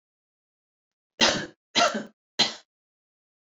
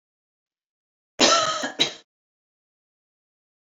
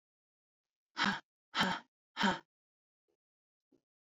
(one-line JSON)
{"three_cough_length": "3.5 s", "three_cough_amplitude": 15730, "three_cough_signal_mean_std_ratio": 0.31, "cough_length": "3.7 s", "cough_amplitude": 21108, "cough_signal_mean_std_ratio": 0.3, "exhalation_length": "4.1 s", "exhalation_amplitude": 4545, "exhalation_signal_mean_std_ratio": 0.3, "survey_phase": "alpha (2021-03-01 to 2021-08-12)", "age": "18-44", "gender": "Female", "wearing_mask": "No", "symptom_none": true, "smoker_status": "Never smoked", "respiratory_condition_asthma": false, "respiratory_condition_other": false, "recruitment_source": "Test and Trace", "submission_delay": "0 days", "covid_test_result": "Negative", "covid_test_method": "LFT"}